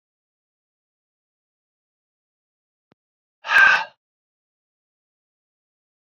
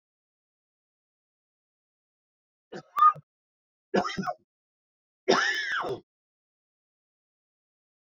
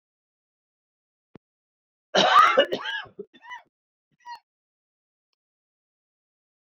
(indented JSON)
{
  "exhalation_length": "6.1 s",
  "exhalation_amplitude": 24017,
  "exhalation_signal_mean_std_ratio": 0.18,
  "three_cough_length": "8.2 s",
  "three_cough_amplitude": 14365,
  "three_cough_signal_mean_std_ratio": 0.27,
  "cough_length": "6.7 s",
  "cough_amplitude": 16979,
  "cough_signal_mean_std_ratio": 0.25,
  "survey_phase": "beta (2021-08-13 to 2022-03-07)",
  "age": "65+",
  "gender": "Male",
  "wearing_mask": "No",
  "symptom_cough_any": true,
  "symptom_runny_or_blocked_nose": true,
  "symptom_shortness_of_breath": true,
  "symptom_sore_throat": true,
  "symptom_abdominal_pain": true,
  "symptom_fatigue": true,
  "symptom_onset": "4 days",
  "smoker_status": "Ex-smoker",
  "respiratory_condition_asthma": false,
  "respiratory_condition_other": false,
  "recruitment_source": "Test and Trace",
  "submission_delay": "2 days",
  "covid_test_result": "Positive",
  "covid_test_method": "RT-qPCR",
  "covid_ct_value": 12.0,
  "covid_ct_gene": "ORF1ab gene",
  "covid_ct_mean": 12.3,
  "covid_viral_load": "89000000 copies/ml",
  "covid_viral_load_category": "High viral load (>1M copies/ml)"
}